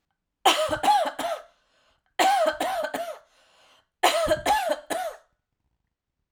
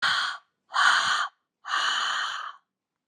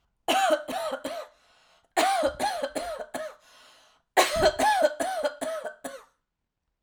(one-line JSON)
{"three_cough_length": "6.3 s", "three_cough_amplitude": 20679, "three_cough_signal_mean_std_ratio": 0.53, "exhalation_length": "3.1 s", "exhalation_amplitude": 14568, "exhalation_signal_mean_std_ratio": 0.64, "cough_length": "6.8 s", "cough_amplitude": 17551, "cough_signal_mean_std_ratio": 0.56, "survey_phase": "alpha (2021-03-01 to 2021-08-12)", "age": "45-64", "gender": "Female", "wearing_mask": "No", "symptom_none": true, "smoker_status": "Never smoked", "respiratory_condition_asthma": false, "respiratory_condition_other": false, "recruitment_source": "REACT", "submission_delay": "1 day", "covid_test_result": "Negative", "covid_test_method": "RT-qPCR"}